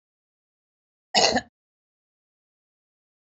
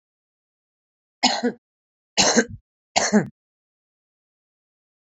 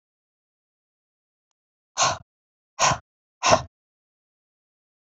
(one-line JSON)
{"cough_length": "3.3 s", "cough_amplitude": 20787, "cough_signal_mean_std_ratio": 0.21, "three_cough_length": "5.1 s", "three_cough_amplitude": 30484, "three_cough_signal_mean_std_ratio": 0.3, "exhalation_length": "5.1 s", "exhalation_amplitude": 26891, "exhalation_signal_mean_std_ratio": 0.24, "survey_phase": "beta (2021-08-13 to 2022-03-07)", "age": "45-64", "gender": "Female", "wearing_mask": "No", "symptom_none": true, "smoker_status": "Current smoker (1 to 10 cigarettes per day)", "respiratory_condition_asthma": false, "respiratory_condition_other": false, "recruitment_source": "REACT", "submission_delay": "4 days", "covid_test_result": "Negative", "covid_test_method": "RT-qPCR", "influenza_a_test_result": "Negative", "influenza_b_test_result": "Negative"}